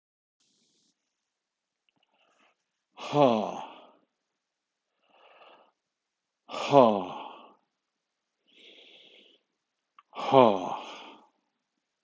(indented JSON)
{
  "exhalation_length": "12.0 s",
  "exhalation_amplitude": 20173,
  "exhalation_signal_mean_std_ratio": 0.23,
  "survey_phase": "beta (2021-08-13 to 2022-03-07)",
  "age": "45-64",
  "gender": "Male",
  "wearing_mask": "No",
  "symptom_none": true,
  "symptom_onset": "6 days",
  "smoker_status": "Ex-smoker",
  "respiratory_condition_asthma": true,
  "respiratory_condition_other": false,
  "recruitment_source": "REACT",
  "submission_delay": "3 days",
  "covid_test_result": "Negative",
  "covid_test_method": "RT-qPCR"
}